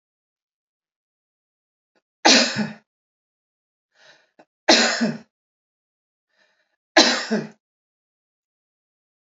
{"three_cough_length": "9.2 s", "three_cough_amplitude": 30789, "three_cough_signal_mean_std_ratio": 0.26, "survey_phase": "alpha (2021-03-01 to 2021-08-12)", "age": "45-64", "gender": "Female", "wearing_mask": "No", "symptom_none": true, "smoker_status": "Never smoked", "respiratory_condition_asthma": false, "respiratory_condition_other": false, "recruitment_source": "REACT", "submission_delay": "1 day", "covid_test_result": "Negative", "covid_test_method": "RT-qPCR"}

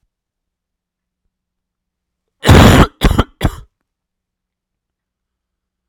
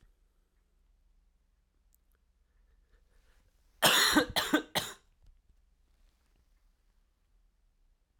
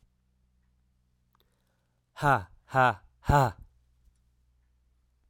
{"cough_length": "5.9 s", "cough_amplitude": 32768, "cough_signal_mean_std_ratio": 0.28, "three_cough_length": "8.2 s", "three_cough_amplitude": 9247, "three_cough_signal_mean_std_ratio": 0.25, "exhalation_length": "5.3 s", "exhalation_amplitude": 11634, "exhalation_signal_mean_std_ratio": 0.27, "survey_phase": "alpha (2021-03-01 to 2021-08-12)", "age": "18-44", "gender": "Male", "wearing_mask": "No", "symptom_cough_any": true, "symptom_new_continuous_cough": true, "symptom_shortness_of_breath": true, "symptom_fatigue": true, "symptom_headache": true, "symptom_onset": "5 days", "smoker_status": "Never smoked", "respiratory_condition_asthma": false, "respiratory_condition_other": false, "recruitment_source": "Test and Trace", "submission_delay": "2 days", "covid_test_result": "Positive", "covid_test_method": "RT-qPCR", "covid_ct_value": 17.2, "covid_ct_gene": "ORF1ab gene", "covid_ct_mean": 17.4, "covid_viral_load": "1900000 copies/ml", "covid_viral_load_category": "High viral load (>1M copies/ml)"}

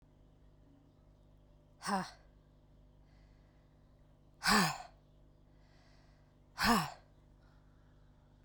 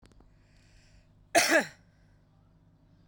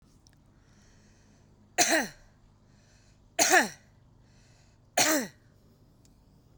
{"exhalation_length": "8.4 s", "exhalation_amplitude": 4842, "exhalation_signal_mean_std_ratio": 0.29, "cough_length": "3.1 s", "cough_amplitude": 13250, "cough_signal_mean_std_ratio": 0.27, "three_cough_length": "6.6 s", "three_cough_amplitude": 13516, "three_cough_signal_mean_std_ratio": 0.31, "survey_phase": "beta (2021-08-13 to 2022-03-07)", "age": "45-64", "gender": "Female", "wearing_mask": "No", "symptom_cough_any": true, "symptom_fatigue": true, "smoker_status": "Current smoker (11 or more cigarettes per day)", "respiratory_condition_asthma": false, "respiratory_condition_other": false, "recruitment_source": "REACT", "submission_delay": "1 day", "covid_test_result": "Negative", "covid_test_method": "RT-qPCR"}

